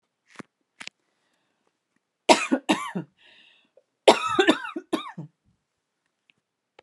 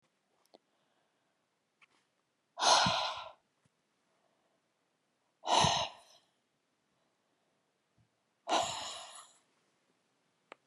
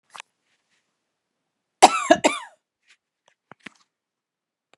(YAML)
three_cough_length: 6.8 s
three_cough_amplitude: 28844
three_cough_signal_mean_std_ratio: 0.26
exhalation_length: 10.7 s
exhalation_amplitude: 8703
exhalation_signal_mean_std_ratio: 0.28
cough_length: 4.8 s
cough_amplitude: 32768
cough_signal_mean_std_ratio: 0.18
survey_phase: beta (2021-08-13 to 2022-03-07)
age: 45-64
gender: Female
wearing_mask: 'No'
symptom_cough_any: true
symptom_fatigue: true
symptom_change_to_sense_of_smell_or_taste: true
symptom_onset: 12 days
smoker_status: Never smoked
respiratory_condition_asthma: true
respiratory_condition_other: false
recruitment_source: REACT
submission_delay: 2 days
covid_test_result: Negative
covid_test_method: RT-qPCR
influenza_a_test_result: Negative
influenza_b_test_result: Negative